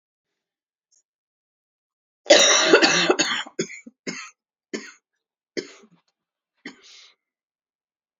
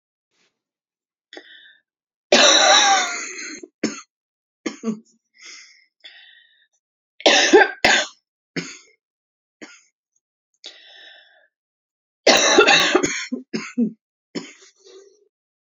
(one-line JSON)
{"cough_length": "8.2 s", "cough_amplitude": 30379, "cough_signal_mean_std_ratio": 0.3, "three_cough_length": "15.6 s", "three_cough_amplitude": 32767, "three_cough_signal_mean_std_ratio": 0.35, "survey_phase": "beta (2021-08-13 to 2022-03-07)", "age": "45-64", "gender": "Female", "wearing_mask": "No", "symptom_cough_any": true, "symptom_runny_or_blocked_nose": true, "symptom_other": true, "symptom_onset": "4 days", "smoker_status": "Never smoked", "respiratory_condition_asthma": false, "respiratory_condition_other": false, "recruitment_source": "Test and Trace", "submission_delay": "2 days", "covid_test_result": "Positive", "covid_test_method": "RT-qPCR", "covid_ct_value": 15.9, "covid_ct_gene": "ORF1ab gene", "covid_ct_mean": 16.5, "covid_viral_load": "4000000 copies/ml", "covid_viral_load_category": "High viral load (>1M copies/ml)"}